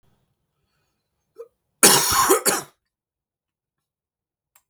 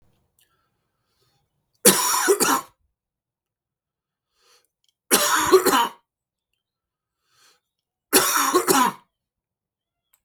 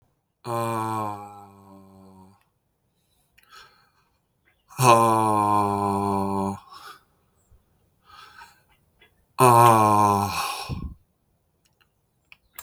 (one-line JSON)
{"cough_length": "4.7 s", "cough_amplitude": 32768, "cough_signal_mean_std_ratio": 0.29, "three_cough_length": "10.2 s", "three_cough_amplitude": 32768, "three_cough_signal_mean_std_ratio": 0.36, "exhalation_length": "12.6 s", "exhalation_amplitude": 31164, "exhalation_signal_mean_std_ratio": 0.4, "survey_phase": "beta (2021-08-13 to 2022-03-07)", "age": "45-64", "gender": "Male", "wearing_mask": "No", "symptom_shortness_of_breath": true, "smoker_status": "Never smoked", "respiratory_condition_asthma": false, "respiratory_condition_other": false, "recruitment_source": "Test and Trace", "submission_delay": "1 day", "covid_test_result": "Positive", "covid_test_method": "LFT"}